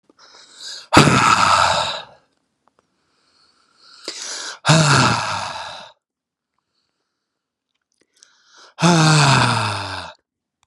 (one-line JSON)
{"exhalation_length": "10.7 s", "exhalation_amplitude": 32768, "exhalation_signal_mean_std_ratio": 0.45, "survey_phase": "beta (2021-08-13 to 2022-03-07)", "age": "45-64", "gender": "Male", "wearing_mask": "No", "symptom_none": true, "smoker_status": "Ex-smoker", "respiratory_condition_asthma": false, "respiratory_condition_other": false, "recruitment_source": "REACT", "submission_delay": "1 day", "covid_test_result": "Negative", "covid_test_method": "RT-qPCR"}